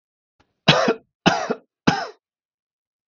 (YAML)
three_cough_length: 3.1 s
three_cough_amplitude: 32768
three_cough_signal_mean_std_ratio: 0.34
survey_phase: beta (2021-08-13 to 2022-03-07)
age: 45-64
gender: Male
wearing_mask: 'No'
symptom_none: true
smoker_status: Ex-smoker
respiratory_condition_asthma: true
respiratory_condition_other: false
recruitment_source: REACT
submission_delay: 15 days
covid_test_result: Negative
covid_test_method: RT-qPCR